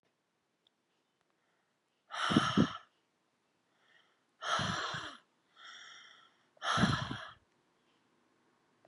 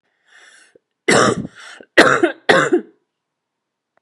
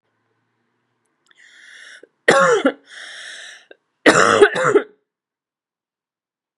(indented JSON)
{
  "exhalation_length": "8.9 s",
  "exhalation_amplitude": 7257,
  "exhalation_signal_mean_std_ratio": 0.34,
  "three_cough_length": "4.0 s",
  "three_cough_amplitude": 32768,
  "three_cough_signal_mean_std_ratio": 0.38,
  "cough_length": "6.6 s",
  "cough_amplitude": 32768,
  "cough_signal_mean_std_ratio": 0.33,
  "survey_phase": "beta (2021-08-13 to 2022-03-07)",
  "age": "18-44",
  "gender": "Female",
  "wearing_mask": "No",
  "symptom_cough_any": true,
  "symptom_runny_or_blocked_nose": true,
  "symptom_sore_throat": true,
  "symptom_fatigue": true,
  "symptom_headache": true,
  "symptom_change_to_sense_of_smell_or_taste": true,
  "symptom_other": true,
  "smoker_status": "Current smoker (e-cigarettes or vapes only)",
  "respiratory_condition_asthma": false,
  "respiratory_condition_other": false,
  "recruitment_source": "Test and Trace",
  "submission_delay": "2 days",
  "covid_test_result": "Positive",
  "covid_test_method": "RT-qPCR",
  "covid_ct_value": 27.8,
  "covid_ct_gene": "ORF1ab gene"
}